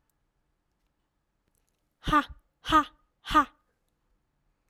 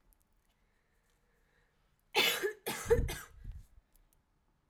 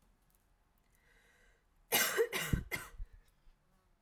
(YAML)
exhalation_length: 4.7 s
exhalation_amplitude: 9938
exhalation_signal_mean_std_ratio: 0.25
three_cough_length: 4.7 s
three_cough_amplitude: 5160
three_cough_signal_mean_std_ratio: 0.33
cough_length: 4.0 s
cough_amplitude: 5618
cough_signal_mean_std_ratio: 0.36
survey_phase: alpha (2021-03-01 to 2021-08-12)
age: 18-44
gender: Female
wearing_mask: 'No'
symptom_none: true
smoker_status: Never smoked
respiratory_condition_asthma: true
respiratory_condition_other: false
recruitment_source: REACT
submission_delay: 1 day
covid_test_result: Negative
covid_test_method: RT-qPCR